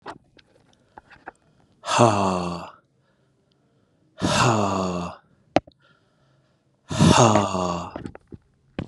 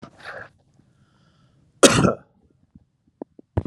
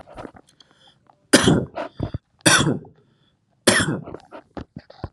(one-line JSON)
{"exhalation_length": "8.9 s", "exhalation_amplitude": 31593, "exhalation_signal_mean_std_ratio": 0.41, "cough_length": "3.7 s", "cough_amplitude": 32767, "cough_signal_mean_std_ratio": 0.24, "three_cough_length": "5.1 s", "three_cough_amplitude": 32767, "three_cough_signal_mean_std_ratio": 0.37, "survey_phase": "alpha (2021-03-01 to 2021-08-12)", "age": "45-64", "gender": "Male", "wearing_mask": "No", "symptom_none": true, "smoker_status": "Never smoked", "respiratory_condition_asthma": false, "respiratory_condition_other": false, "recruitment_source": "Test and Trace", "submission_delay": "0 days", "covid_test_result": "Negative", "covid_test_method": "LFT"}